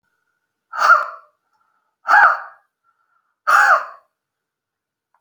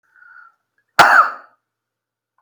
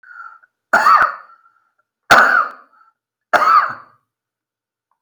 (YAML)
exhalation_length: 5.2 s
exhalation_amplitude: 30670
exhalation_signal_mean_std_ratio: 0.35
cough_length: 2.4 s
cough_amplitude: 32768
cough_signal_mean_std_ratio: 0.29
three_cough_length: 5.0 s
three_cough_amplitude: 32768
three_cough_signal_mean_std_ratio: 0.4
survey_phase: beta (2021-08-13 to 2022-03-07)
age: 45-64
gender: Male
wearing_mask: 'No'
symptom_runny_or_blocked_nose: true
smoker_status: Never smoked
respiratory_condition_asthma: false
respiratory_condition_other: false
recruitment_source: REACT
submission_delay: 1 day
covid_test_result: Negative
covid_test_method: RT-qPCR